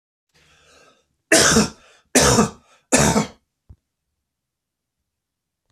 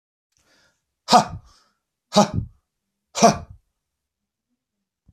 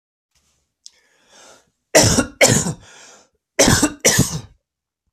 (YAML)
three_cough_length: 5.7 s
three_cough_amplitude: 29916
three_cough_signal_mean_std_ratio: 0.35
exhalation_length: 5.1 s
exhalation_amplitude: 32768
exhalation_signal_mean_std_ratio: 0.25
cough_length: 5.1 s
cough_amplitude: 32768
cough_signal_mean_std_ratio: 0.39
survey_phase: beta (2021-08-13 to 2022-03-07)
age: 45-64
gender: Male
wearing_mask: 'No'
symptom_none: true
smoker_status: Never smoked
respiratory_condition_asthma: true
respiratory_condition_other: false
recruitment_source: REACT
submission_delay: 1 day
covid_test_result: Negative
covid_test_method: RT-qPCR